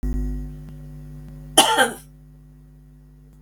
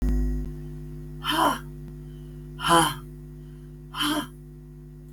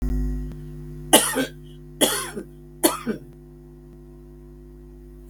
cough_length: 3.4 s
cough_amplitude: 32768
cough_signal_mean_std_ratio: 0.44
exhalation_length: 5.1 s
exhalation_amplitude: 18295
exhalation_signal_mean_std_ratio: 0.61
three_cough_length: 5.3 s
three_cough_amplitude: 32768
three_cough_signal_mean_std_ratio: 0.47
survey_phase: beta (2021-08-13 to 2022-03-07)
age: 65+
gender: Female
wearing_mask: 'No'
symptom_shortness_of_breath: true
symptom_fatigue: true
symptom_headache: true
symptom_onset: 12 days
smoker_status: Ex-smoker
respiratory_condition_asthma: false
respiratory_condition_other: false
recruitment_source: REACT
submission_delay: 1 day
covid_test_result: Negative
covid_test_method: RT-qPCR
influenza_a_test_result: Negative
influenza_b_test_result: Negative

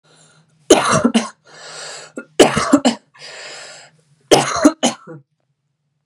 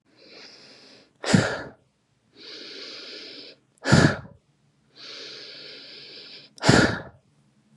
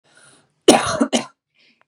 three_cough_length: 6.1 s
three_cough_amplitude: 32768
three_cough_signal_mean_std_ratio: 0.39
exhalation_length: 7.8 s
exhalation_amplitude: 26244
exhalation_signal_mean_std_ratio: 0.32
cough_length: 1.9 s
cough_amplitude: 32768
cough_signal_mean_std_ratio: 0.34
survey_phase: beta (2021-08-13 to 2022-03-07)
age: 18-44
gender: Female
wearing_mask: 'No'
symptom_none: true
smoker_status: Never smoked
respiratory_condition_asthma: false
respiratory_condition_other: false
recruitment_source: REACT
submission_delay: 1 day
covid_test_result: Negative
covid_test_method: RT-qPCR
influenza_a_test_result: Negative
influenza_b_test_result: Negative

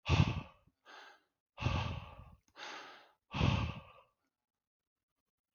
exhalation_length: 5.5 s
exhalation_amplitude: 5324
exhalation_signal_mean_std_ratio: 0.37
survey_phase: beta (2021-08-13 to 2022-03-07)
age: 18-44
gender: Male
wearing_mask: 'No'
symptom_none: true
smoker_status: Never smoked
respiratory_condition_asthma: false
respiratory_condition_other: false
recruitment_source: REACT
submission_delay: 3 days
covid_test_result: Negative
covid_test_method: RT-qPCR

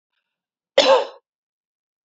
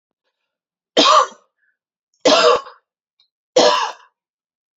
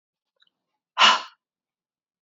cough_length: 2.0 s
cough_amplitude: 29272
cough_signal_mean_std_ratio: 0.28
three_cough_length: 4.8 s
three_cough_amplitude: 28998
three_cough_signal_mean_std_ratio: 0.37
exhalation_length: 2.2 s
exhalation_amplitude: 25815
exhalation_signal_mean_std_ratio: 0.24
survey_phase: beta (2021-08-13 to 2022-03-07)
age: 18-44
gender: Female
wearing_mask: 'No'
symptom_runny_or_blocked_nose: true
symptom_fatigue: true
symptom_headache: true
symptom_onset: 4 days
smoker_status: Never smoked
respiratory_condition_asthma: false
respiratory_condition_other: false
recruitment_source: Test and Trace
submission_delay: 2 days
covid_test_result: Positive
covid_test_method: ePCR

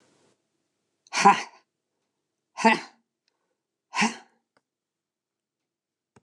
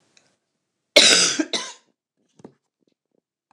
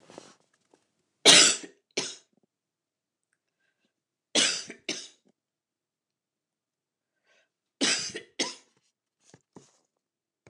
exhalation_length: 6.2 s
exhalation_amplitude: 23487
exhalation_signal_mean_std_ratio: 0.22
cough_length: 3.5 s
cough_amplitude: 29204
cough_signal_mean_std_ratio: 0.29
three_cough_length: 10.5 s
three_cough_amplitude: 28673
three_cough_signal_mean_std_ratio: 0.22
survey_phase: beta (2021-08-13 to 2022-03-07)
age: 65+
gender: Female
wearing_mask: 'No'
symptom_cough_any: true
symptom_runny_or_blocked_nose: true
symptom_sore_throat: true
symptom_onset: 7 days
smoker_status: Never smoked
respiratory_condition_asthma: false
respiratory_condition_other: false
recruitment_source: Test and Trace
submission_delay: 1 day
covid_test_result: Negative
covid_test_method: RT-qPCR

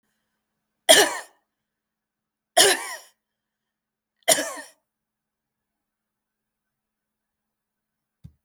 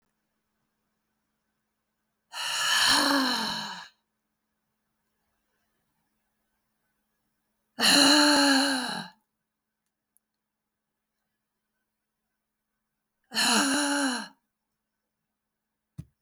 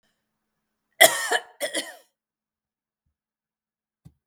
three_cough_length: 8.4 s
three_cough_amplitude: 32766
three_cough_signal_mean_std_ratio: 0.21
exhalation_length: 16.2 s
exhalation_amplitude: 16160
exhalation_signal_mean_std_ratio: 0.36
cough_length: 4.3 s
cough_amplitude: 32766
cough_signal_mean_std_ratio: 0.21
survey_phase: beta (2021-08-13 to 2022-03-07)
age: 45-64
gender: Female
wearing_mask: 'No'
symptom_none: true
smoker_status: Never smoked
respiratory_condition_asthma: false
respiratory_condition_other: false
recruitment_source: REACT
submission_delay: 1 day
covid_test_result: Negative
covid_test_method: RT-qPCR
influenza_a_test_result: Negative
influenza_b_test_result: Negative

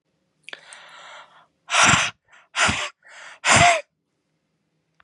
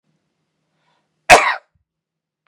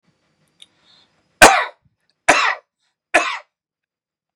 exhalation_length: 5.0 s
exhalation_amplitude: 26554
exhalation_signal_mean_std_ratio: 0.37
cough_length: 2.5 s
cough_amplitude: 32768
cough_signal_mean_std_ratio: 0.22
three_cough_length: 4.4 s
three_cough_amplitude: 32768
three_cough_signal_mean_std_ratio: 0.27
survey_phase: beta (2021-08-13 to 2022-03-07)
age: 18-44
gender: Male
wearing_mask: 'No'
symptom_none: true
smoker_status: Current smoker (e-cigarettes or vapes only)
respiratory_condition_asthma: false
respiratory_condition_other: false
recruitment_source: REACT
submission_delay: 11 days
covid_test_result: Negative
covid_test_method: RT-qPCR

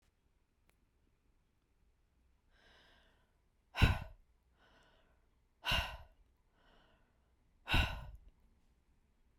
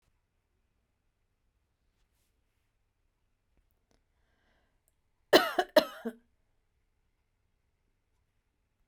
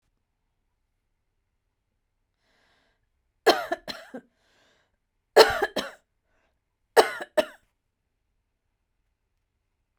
exhalation_length: 9.4 s
exhalation_amplitude: 5739
exhalation_signal_mean_std_ratio: 0.24
cough_length: 8.9 s
cough_amplitude: 15192
cough_signal_mean_std_ratio: 0.14
three_cough_length: 10.0 s
three_cough_amplitude: 32767
three_cough_signal_mean_std_ratio: 0.19
survey_phase: beta (2021-08-13 to 2022-03-07)
age: 45-64
gender: Female
wearing_mask: 'No'
symptom_none: true
smoker_status: Ex-smoker
respiratory_condition_asthma: false
respiratory_condition_other: false
recruitment_source: REACT
submission_delay: 1 day
covid_test_result: Negative
covid_test_method: RT-qPCR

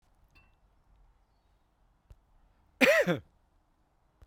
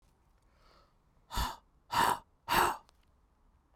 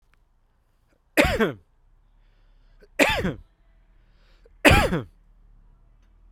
cough_length: 4.3 s
cough_amplitude: 14998
cough_signal_mean_std_ratio: 0.24
exhalation_length: 3.8 s
exhalation_amplitude: 5982
exhalation_signal_mean_std_ratio: 0.36
three_cough_length: 6.3 s
three_cough_amplitude: 32768
three_cough_signal_mean_std_ratio: 0.31
survey_phase: beta (2021-08-13 to 2022-03-07)
age: 18-44
gender: Male
wearing_mask: 'No'
symptom_cough_any: true
symptom_runny_or_blocked_nose: true
symptom_headache: true
symptom_change_to_sense_of_smell_or_taste: true
smoker_status: Never smoked
respiratory_condition_asthma: false
respiratory_condition_other: false
recruitment_source: Test and Trace
submission_delay: 2 days
covid_test_result: Positive
covid_test_method: RT-qPCR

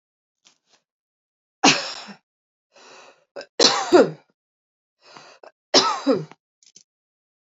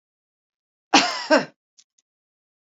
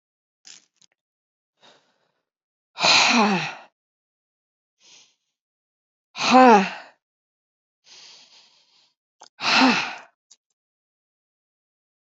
three_cough_length: 7.5 s
three_cough_amplitude: 30004
three_cough_signal_mean_std_ratio: 0.28
cough_length: 2.7 s
cough_amplitude: 27460
cough_signal_mean_std_ratio: 0.26
exhalation_length: 12.1 s
exhalation_amplitude: 29090
exhalation_signal_mean_std_ratio: 0.28
survey_phase: beta (2021-08-13 to 2022-03-07)
age: 45-64
gender: Female
wearing_mask: 'No'
symptom_none: true
smoker_status: Never smoked
respiratory_condition_asthma: false
respiratory_condition_other: false
recruitment_source: REACT
submission_delay: 4 days
covid_test_result: Negative
covid_test_method: RT-qPCR
influenza_a_test_result: Negative
influenza_b_test_result: Negative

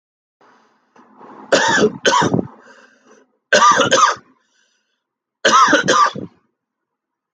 three_cough_length: 7.3 s
three_cough_amplitude: 31301
three_cough_signal_mean_std_ratio: 0.45
survey_phase: alpha (2021-03-01 to 2021-08-12)
age: 18-44
gender: Male
wearing_mask: 'No'
symptom_fatigue: true
symptom_onset: 4 days
smoker_status: Never smoked
respiratory_condition_asthma: true
respiratory_condition_other: false
recruitment_source: Test and Trace
submission_delay: 2 days
covid_test_result: Positive
covid_test_method: RT-qPCR
covid_ct_value: 12.2
covid_ct_gene: ORF1ab gene
covid_ct_mean: 13.0
covid_viral_load: 54000000 copies/ml
covid_viral_load_category: High viral load (>1M copies/ml)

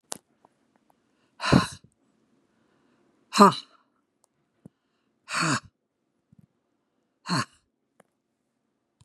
exhalation_length: 9.0 s
exhalation_amplitude: 32113
exhalation_signal_mean_std_ratio: 0.2
survey_phase: beta (2021-08-13 to 2022-03-07)
age: 65+
gender: Female
wearing_mask: 'No'
symptom_none: true
smoker_status: Ex-smoker
respiratory_condition_asthma: false
respiratory_condition_other: false
recruitment_source: REACT
submission_delay: 2 days
covid_test_result: Negative
covid_test_method: RT-qPCR
influenza_a_test_result: Negative
influenza_b_test_result: Negative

